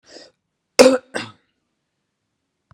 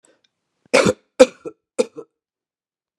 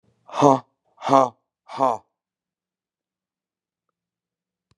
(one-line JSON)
{"cough_length": "2.7 s", "cough_amplitude": 32768, "cough_signal_mean_std_ratio": 0.22, "three_cough_length": "3.0 s", "three_cough_amplitude": 32768, "three_cough_signal_mean_std_ratio": 0.23, "exhalation_length": "4.8 s", "exhalation_amplitude": 28627, "exhalation_signal_mean_std_ratio": 0.24, "survey_phase": "beta (2021-08-13 to 2022-03-07)", "age": "65+", "gender": "Female", "wearing_mask": "No", "symptom_cough_any": true, "symptom_runny_or_blocked_nose": true, "symptom_sore_throat": true, "symptom_diarrhoea": true, "symptom_fatigue": true, "symptom_headache": true, "symptom_change_to_sense_of_smell_or_taste": true, "smoker_status": "Never smoked", "respiratory_condition_asthma": false, "respiratory_condition_other": false, "recruitment_source": "Test and Trace", "submission_delay": "0 days", "covid_test_result": "Positive", "covid_test_method": "LFT"}